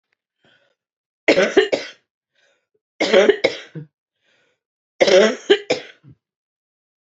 {"three_cough_length": "7.1 s", "three_cough_amplitude": 32767, "three_cough_signal_mean_std_ratio": 0.34, "survey_phase": "beta (2021-08-13 to 2022-03-07)", "age": "45-64", "gender": "Female", "wearing_mask": "No", "symptom_cough_any": true, "symptom_runny_or_blocked_nose": true, "symptom_fatigue": true, "smoker_status": "Current smoker (11 or more cigarettes per day)", "recruitment_source": "Test and Trace", "submission_delay": "2 days", "covid_test_result": "Positive", "covid_test_method": "RT-qPCR", "covid_ct_value": 19.6, "covid_ct_gene": "ORF1ab gene", "covid_ct_mean": 20.0, "covid_viral_load": "270000 copies/ml", "covid_viral_load_category": "Low viral load (10K-1M copies/ml)"}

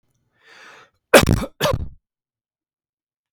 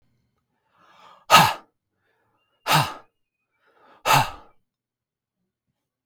{"cough_length": "3.3 s", "cough_amplitude": 32768, "cough_signal_mean_std_ratio": 0.27, "exhalation_length": "6.1 s", "exhalation_amplitude": 32766, "exhalation_signal_mean_std_ratio": 0.25, "survey_phase": "beta (2021-08-13 to 2022-03-07)", "age": "45-64", "gender": "Male", "wearing_mask": "No", "symptom_none": true, "smoker_status": "Ex-smoker", "respiratory_condition_asthma": false, "respiratory_condition_other": false, "recruitment_source": "REACT", "submission_delay": "7 days", "covid_test_result": "Negative", "covid_test_method": "RT-qPCR"}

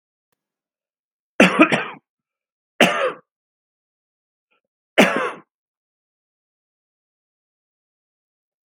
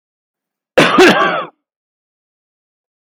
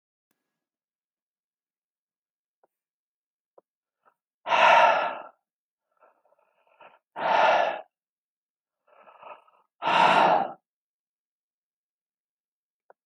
{"three_cough_length": "8.7 s", "three_cough_amplitude": 32768, "three_cough_signal_mean_std_ratio": 0.24, "cough_length": "3.1 s", "cough_amplitude": 32768, "cough_signal_mean_std_ratio": 0.37, "exhalation_length": "13.1 s", "exhalation_amplitude": 15901, "exhalation_signal_mean_std_ratio": 0.3, "survey_phase": "beta (2021-08-13 to 2022-03-07)", "age": "65+", "gender": "Male", "wearing_mask": "No", "symptom_none": true, "smoker_status": "Never smoked", "respiratory_condition_asthma": false, "respiratory_condition_other": false, "recruitment_source": "REACT", "submission_delay": "2 days", "covid_test_result": "Negative", "covid_test_method": "RT-qPCR", "influenza_a_test_result": "Unknown/Void", "influenza_b_test_result": "Unknown/Void"}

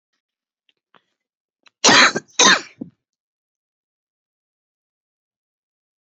{"cough_length": "6.1 s", "cough_amplitude": 32754, "cough_signal_mean_std_ratio": 0.23, "survey_phase": "beta (2021-08-13 to 2022-03-07)", "age": "45-64", "gender": "Female", "wearing_mask": "No", "symptom_cough_any": true, "symptom_new_continuous_cough": true, "symptom_runny_or_blocked_nose": true, "symptom_shortness_of_breath": true, "symptom_sore_throat": true, "symptom_abdominal_pain": true, "symptom_fatigue": true, "symptom_fever_high_temperature": true, "symptom_headache": true, "symptom_change_to_sense_of_smell_or_taste": true, "symptom_loss_of_taste": true, "symptom_other": true, "symptom_onset": "3 days", "smoker_status": "Never smoked", "respiratory_condition_asthma": false, "respiratory_condition_other": true, "recruitment_source": "Test and Trace", "submission_delay": "2 days", "covid_test_result": "Positive", "covid_test_method": "RT-qPCR", "covid_ct_value": 17.4, "covid_ct_gene": "ORF1ab gene", "covid_ct_mean": 17.9, "covid_viral_load": "1400000 copies/ml", "covid_viral_load_category": "High viral load (>1M copies/ml)"}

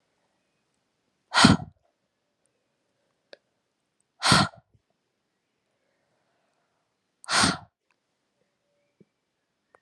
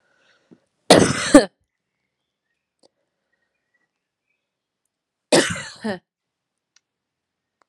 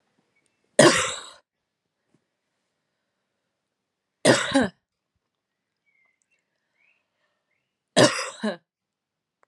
{"exhalation_length": "9.8 s", "exhalation_amplitude": 26856, "exhalation_signal_mean_std_ratio": 0.21, "cough_length": "7.7 s", "cough_amplitude": 32768, "cough_signal_mean_std_ratio": 0.21, "three_cough_length": "9.5 s", "three_cough_amplitude": 27806, "three_cough_signal_mean_std_ratio": 0.24, "survey_phase": "alpha (2021-03-01 to 2021-08-12)", "age": "18-44", "gender": "Female", "wearing_mask": "No", "symptom_cough_any": true, "symptom_fatigue": true, "smoker_status": "Never smoked", "respiratory_condition_asthma": false, "respiratory_condition_other": false, "recruitment_source": "Test and Trace", "submission_delay": "2 days", "covid_test_result": "Positive", "covid_test_method": "RT-qPCR", "covid_ct_value": 20.9, "covid_ct_gene": "ORF1ab gene", "covid_ct_mean": 21.4, "covid_viral_load": "99000 copies/ml", "covid_viral_load_category": "Low viral load (10K-1M copies/ml)"}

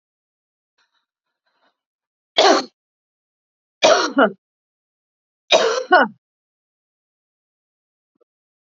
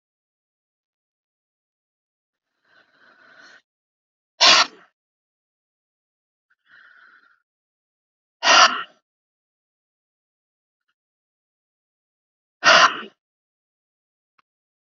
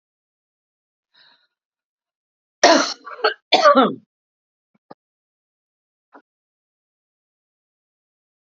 {"three_cough_length": "8.7 s", "three_cough_amplitude": 29607, "three_cough_signal_mean_std_ratio": 0.27, "exhalation_length": "14.9 s", "exhalation_amplitude": 29846, "exhalation_signal_mean_std_ratio": 0.19, "cough_length": "8.4 s", "cough_amplitude": 32274, "cough_signal_mean_std_ratio": 0.22, "survey_phase": "alpha (2021-03-01 to 2021-08-12)", "age": "45-64", "gender": "Female", "wearing_mask": "No", "symptom_cough_any": true, "symptom_headache": true, "symptom_onset": "9 days", "smoker_status": "Current smoker (11 or more cigarettes per day)", "respiratory_condition_asthma": false, "respiratory_condition_other": false, "recruitment_source": "REACT", "submission_delay": "2 days", "covid_test_result": "Negative", "covid_test_method": "RT-qPCR"}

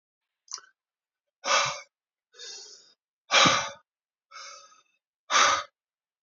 {"exhalation_length": "6.2 s", "exhalation_amplitude": 18050, "exhalation_signal_mean_std_ratio": 0.33, "survey_phase": "beta (2021-08-13 to 2022-03-07)", "age": "65+", "gender": "Male", "wearing_mask": "No", "symptom_cough_any": true, "symptom_runny_or_blocked_nose": true, "smoker_status": "Never smoked", "respiratory_condition_asthma": false, "respiratory_condition_other": false, "recruitment_source": "Test and Trace", "submission_delay": "2 days", "covid_test_result": "Positive", "covid_test_method": "LFT"}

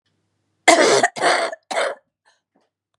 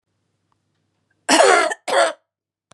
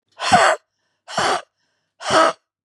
{"three_cough_length": "3.0 s", "three_cough_amplitude": 32767, "three_cough_signal_mean_std_ratio": 0.43, "cough_length": "2.7 s", "cough_amplitude": 30684, "cough_signal_mean_std_ratio": 0.39, "exhalation_length": "2.6 s", "exhalation_amplitude": 30041, "exhalation_signal_mean_std_ratio": 0.45, "survey_phase": "beta (2021-08-13 to 2022-03-07)", "age": "45-64", "gender": "Female", "wearing_mask": "No", "symptom_cough_any": true, "symptom_runny_or_blocked_nose": true, "symptom_fatigue": true, "symptom_onset": "8 days", "smoker_status": "Ex-smoker", "respiratory_condition_asthma": false, "respiratory_condition_other": false, "recruitment_source": "Test and Trace", "submission_delay": "2 days", "covid_test_result": "Positive", "covid_test_method": "ePCR"}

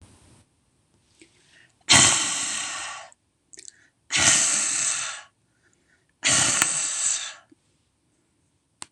{"exhalation_length": "8.9 s", "exhalation_amplitude": 26028, "exhalation_signal_mean_std_ratio": 0.45, "survey_phase": "beta (2021-08-13 to 2022-03-07)", "age": "45-64", "gender": "Female", "wearing_mask": "No", "symptom_none": true, "smoker_status": "Never smoked", "respiratory_condition_asthma": true, "respiratory_condition_other": false, "recruitment_source": "REACT", "submission_delay": "1 day", "covid_test_result": "Negative", "covid_test_method": "RT-qPCR", "influenza_a_test_result": "Negative", "influenza_b_test_result": "Negative"}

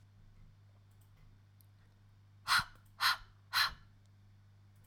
{"exhalation_length": "4.9 s", "exhalation_amplitude": 4765, "exhalation_signal_mean_std_ratio": 0.32, "survey_phase": "alpha (2021-03-01 to 2021-08-12)", "age": "18-44", "gender": "Female", "wearing_mask": "No", "symptom_fatigue": true, "smoker_status": "Never smoked", "respiratory_condition_asthma": false, "respiratory_condition_other": false, "recruitment_source": "REACT", "submission_delay": "32 days", "covid_test_result": "Negative", "covid_test_method": "RT-qPCR"}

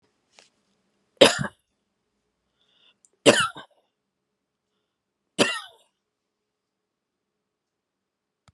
{"three_cough_length": "8.5 s", "three_cough_amplitude": 32032, "three_cough_signal_mean_std_ratio": 0.18, "survey_phase": "beta (2021-08-13 to 2022-03-07)", "age": "65+", "gender": "Female", "wearing_mask": "No", "symptom_abdominal_pain": true, "symptom_headache": true, "symptom_onset": "11 days", "smoker_status": "Ex-smoker", "respiratory_condition_asthma": false, "respiratory_condition_other": false, "recruitment_source": "REACT", "submission_delay": "6 days", "covid_test_result": "Negative", "covid_test_method": "RT-qPCR"}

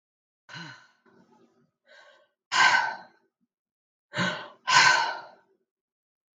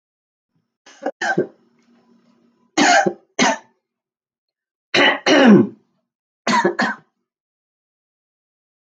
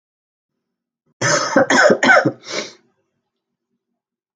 {"exhalation_length": "6.4 s", "exhalation_amplitude": 19484, "exhalation_signal_mean_std_ratio": 0.33, "three_cough_length": "9.0 s", "three_cough_amplitude": 32504, "three_cough_signal_mean_std_ratio": 0.35, "cough_length": "4.4 s", "cough_amplitude": 32477, "cough_signal_mean_std_ratio": 0.39, "survey_phase": "beta (2021-08-13 to 2022-03-07)", "age": "45-64", "gender": "Female", "wearing_mask": "No", "symptom_cough_any": true, "symptom_runny_or_blocked_nose": true, "symptom_sore_throat": true, "symptom_headache": true, "symptom_onset": "4 days", "smoker_status": "Never smoked", "respiratory_condition_asthma": false, "respiratory_condition_other": false, "recruitment_source": "REACT", "submission_delay": "2 days", "covid_test_result": "Positive", "covid_test_method": "RT-qPCR", "covid_ct_value": 32.4, "covid_ct_gene": "E gene", "influenza_a_test_result": "Negative", "influenza_b_test_result": "Negative"}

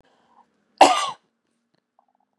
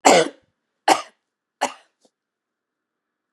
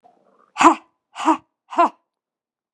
{"cough_length": "2.4 s", "cough_amplitude": 32768, "cough_signal_mean_std_ratio": 0.22, "three_cough_length": "3.3 s", "three_cough_amplitude": 32767, "three_cough_signal_mean_std_ratio": 0.25, "exhalation_length": "2.7 s", "exhalation_amplitude": 32767, "exhalation_signal_mean_std_ratio": 0.3, "survey_phase": "beta (2021-08-13 to 2022-03-07)", "age": "45-64", "gender": "Female", "wearing_mask": "No", "symptom_none": true, "symptom_onset": "6 days", "smoker_status": "Never smoked", "respiratory_condition_asthma": false, "respiratory_condition_other": false, "recruitment_source": "REACT", "submission_delay": "3 days", "covid_test_result": "Negative", "covid_test_method": "RT-qPCR", "influenza_a_test_result": "Negative", "influenza_b_test_result": "Negative"}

